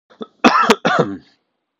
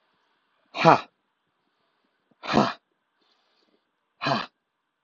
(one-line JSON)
{"cough_length": "1.8 s", "cough_amplitude": 32768, "cough_signal_mean_std_ratio": 0.45, "exhalation_length": "5.0 s", "exhalation_amplitude": 30727, "exhalation_signal_mean_std_ratio": 0.24, "survey_phase": "alpha (2021-03-01 to 2021-08-12)", "age": "18-44", "gender": "Male", "wearing_mask": "No", "symptom_change_to_sense_of_smell_or_taste": true, "symptom_onset": "8 days", "smoker_status": "Ex-smoker", "respiratory_condition_asthma": false, "respiratory_condition_other": false, "recruitment_source": "REACT", "submission_delay": "2 days", "covid_test_result": "Negative", "covid_test_method": "RT-qPCR"}